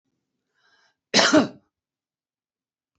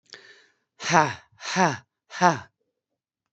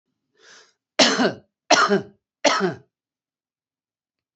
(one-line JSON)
{"cough_length": "3.0 s", "cough_amplitude": 22842, "cough_signal_mean_std_ratio": 0.26, "exhalation_length": "3.3 s", "exhalation_amplitude": 27526, "exhalation_signal_mean_std_ratio": 0.32, "three_cough_length": "4.4 s", "three_cough_amplitude": 30960, "three_cough_signal_mean_std_ratio": 0.36, "survey_phase": "beta (2021-08-13 to 2022-03-07)", "age": "45-64", "gender": "Female", "wearing_mask": "No", "symptom_none": true, "smoker_status": "Current smoker (11 or more cigarettes per day)", "respiratory_condition_asthma": false, "respiratory_condition_other": false, "recruitment_source": "REACT", "submission_delay": "3 days", "covid_test_result": "Negative", "covid_test_method": "RT-qPCR", "influenza_a_test_result": "Negative", "influenza_b_test_result": "Negative"}